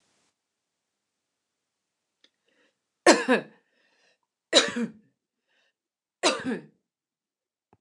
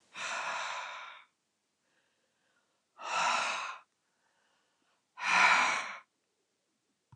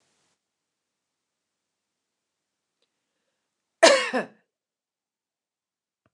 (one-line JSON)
{"three_cough_length": "7.8 s", "three_cough_amplitude": 24397, "three_cough_signal_mean_std_ratio": 0.23, "exhalation_length": "7.2 s", "exhalation_amplitude": 7328, "exhalation_signal_mean_std_ratio": 0.41, "cough_length": "6.1 s", "cough_amplitude": 28063, "cough_signal_mean_std_ratio": 0.16, "survey_phase": "beta (2021-08-13 to 2022-03-07)", "age": "65+", "gender": "Female", "wearing_mask": "No", "symptom_none": true, "smoker_status": "Never smoked", "respiratory_condition_asthma": false, "respiratory_condition_other": false, "recruitment_source": "REACT", "submission_delay": "3 days", "covid_test_result": "Negative", "covid_test_method": "RT-qPCR", "influenza_a_test_result": "Unknown/Void", "influenza_b_test_result": "Unknown/Void"}